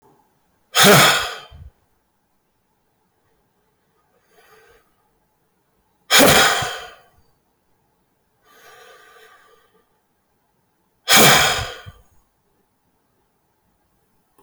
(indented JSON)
{
  "exhalation_length": "14.4 s",
  "exhalation_amplitude": 29153,
  "exhalation_signal_mean_std_ratio": 0.29,
  "survey_phase": "beta (2021-08-13 to 2022-03-07)",
  "age": "18-44",
  "gender": "Male",
  "wearing_mask": "No",
  "symptom_cough_any": true,
  "symptom_new_continuous_cough": true,
  "symptom_runny_or_blocked_nose": true,
  "symptom_shortness_of_breath": true,
  "symptom_sore_throat": true,
  "symptom_fatigue": true,
  "symptom_fever_high_temperature": true,
  "symptom_headache": true,
  "symptom_change_to_sense_of_smell_or_taste": true,
  "symptom_onset": "4 days",
  "smoker_status": "Never smoked",
  "respiratory_condition_asthma": true,
  "respiratory_condition_other": false,
  "recruitment_source": "Test and Trace",
  "submission_delay": "1 day",
  "covid_test_result": "Positive",
  "covid_test_method": "RT-qPCR"
}